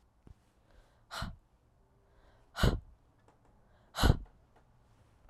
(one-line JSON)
{"exhalation_length": "5.3 s", "exhalation_amplitude": 9349, "exhalation_signal_mean_std_ratio": 0.24, "survey_phase": "alpha (2021-03-01 to 2021-08-12)", "age": "18-44", "gender": "Female", "wearing_mask": "No", "symptom_fatigue": true, "symptom_fever_high_temperature": true, "symptom_headache": true, "symptom_change_to_sense_of_smell_or_taste": true, "symptom_loss_of_taste": true, "symptom_onset": "5 days", "smoker_status": "Never smoked", "respiratory_condition_asthma": false, "respiratory_condition_other": false, "recruitment_source": "Test and Trace", "submission_delay": "2 days", "covid_test_result": "Positive", "covid_test_method": "RT-qPCR"}